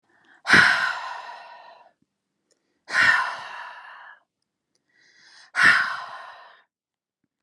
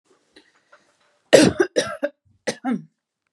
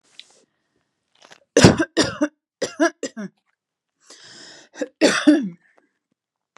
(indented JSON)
{
  "exhalation_length": "7.4 s",
  "exhalation_amplitude": 27209,
  "exhalation_signal_mean_std_ratio": 0.36,
  "cough_length": "3.3 s",
  "cough_amplitude": 32768,
  "cough_signal_mean_std_ratio": 0.3,
  "three_cough_length": "6.6 s",
  "three_cough_amplitude": 32768,
  "three_cough_signal_mean_std_ratio": 0.31,
  "survey_phase": "beta (2021-08-13 to 2022-03-07)",
  "age": "18-44",
  "gender": "Female",
  "wearing_mask": "No",
  "symptom_fatigue": true,
  "smoker_status": "Ex-smoker",
  "respiratory_condition_asthma": false,
  "respiratory_condition_other": false,
  "recruitment_source": "REACT",
  "submission_delay": "9 days",
  "covid_test_result": "Negative",
  "covid_test_method": "RT-qPCR",
  "influenza_a_test_result": "Negative",
  "influenza_b_test_result": "Negative"
}